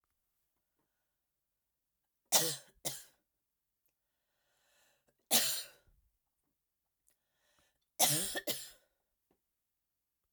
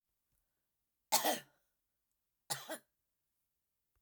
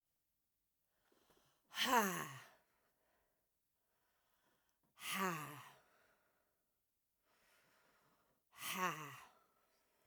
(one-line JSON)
{"three_cough_length": "10.3 s", "three_cough_amplitude": 9554, "three_cough_signal_mean_std_ratio": 0.25, "cough_length": "4.0 s", "cough_amplitude": 5749, "cough_signal_mean_std_ratio": 0.23, "exhalation_length": "10.1 s", "exhalation_amplitude": 3204, "exhalation_signal_mean_std_ratio": 0.3, "survey_phase": "alpha (2021-03-01 to 2021-08-12)", "age": "18-44", "gender": "Female", "wearing_mask": "No", "symptom_shortness_of_breath": true, "symptom_fatigue": true, "symptom_headache": true, "symptom_onset": "12 days", "smoker_status": "Ex-smoker", "respiratory_condition_asthma": false, "respiratory_condition_other": false, "recruitment_source": "REACT", "submission_delay": "3 days", "covid_test_result": "Negative", "covid_test_method": "RT-qPCR"}